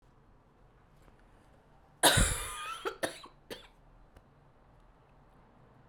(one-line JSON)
{"cough_length": "5.9 s", "cough_amplitude": 14447, "cough_signal_mean_std_ratio": 0.29, "survey_phase": "beta (2021-08-13 to 2022-03-07)", "age": "18-44", "gender": "Female", "wearing_mask": "No", "symptom_cough_any": true, "symptom_runny_or_blocked_nose": true, "symptom_sore_throat": true, "symptom_headache": true, "symptom_onset": "3 days", "smoker_status": "Never smoked", "respiratory_condition_asthma": false, "respiratory_condition_other": false, "recruitment_source": "Test and Trace", "submission_delay": "1 day", "covid_test_result": "Positive", "covid_test_method": "RT-qPCR", "covid_ct_value": 34.9, "covid_ct_gene": "N gene"}